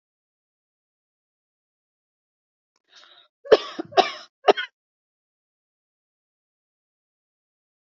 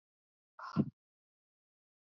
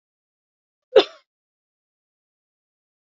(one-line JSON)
{"three_cough_length": "7.9 s", "three_cough_amplitude": 29366, "three_cough_signal_mean_std_ratio": 0.14, "exhalation_length": "2.0 s", "exhalation_amplitude": 3746, "exhalation_signal_mean_std_ratio": 0.2, "cough_length": "3.1 s", "cough_amplitude": 27713, "cough_signal_mean_std_ratio": 0.12, "survey_phase": "alpha (2021-03-01 to 2021-08-12)", "age": "18-44", "gender": "Female", "wearing_mask": "No", "symptom_none": true, "smoker_status": "Ex-smoker", "respiratory_condition_asthma": true, "respiratory_condition_other": false, "recruitment_source": "REACT", "submission_delay": "2 days", "covid_test_result": "Negative", "covid_test_method": "RT-qPCR"}